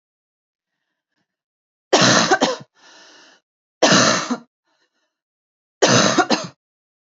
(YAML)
three_cough_length: 7.2 s
three_cough_amplitude: 28947
three_cough_signal_mean_std_ratio: 0.38
survey_phase: beta (2021-08-13 to 2022-03-07)
age: 18-44
gender: Female
wearing_mask: 'No'
symptom_cough_any: true
symptom_sore_throat: true
symptom_onset: 5 days
smoker_status: Never smoked
respiratory_condition_asthma: false
respiratory_condition_other: false
recruitment_source: REACT
submission_delay: 4 days
covid_test_result: Negative
covid_test_method: RT-qPCR
influenza_a_test_result: Negative
influenza_b_test_result: Negative